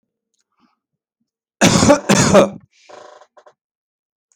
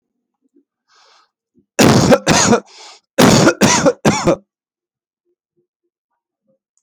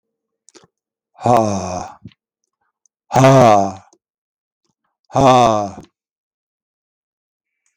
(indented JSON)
{
  "cough_length": "4.4 s",
  "cough_amplitude": 30629,
  "cough_signal_mean_std_ratio": 0.35,
  "three_cough_length": "6.8 s",
  "three_cough_amplitude": 32768,
  "three_cough_signal_mean_std_ratio": 0.41,
  "exhalation_length": "7.8 s",
  "exhalation_amplitude": 31935,
  "exhalation_signal_mean_std_ratio": 0.36,
  "survey_phase": "beta (2021-08-13 to 2022-03-07)",
  "age": "45-64",
  "gender": "Male",
  "wearing_mask": "No",
  "symptom_none": true,
  "smoker_status": "Never smoked",
  "respiratory_condition_asthma": false,
  "respiratory_condition_other": false,
  "recruitment_source": "REACT",
  "submission_delay": "1 day",
  "covid_test_result": "Negative",
  "covid_test_method": "RT-qPCR"
}